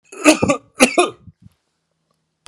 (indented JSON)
{
  "cough_length": "2.5 s",
  "cough_amplitude": 32768,
  "cough_signal_mean_std_ratio": 0.34,
  "survey_phase": "alpha (2021-03-01 to 2021-08-12)",
  "age": "65+",
  "gender": "Male",
  "wearing_mask": "No",
  "symptom_none": true,
  "smoker_status": "Never smoked",
  "respiratory_condition_asthma": false,
  "respiratory_condition_other": false,
  "recruitment_source": "REACT",
  "submission_delay": "2 days",
  "covid_test_result": "Negative",
  "covid_test_method": "RT-qPCR"
}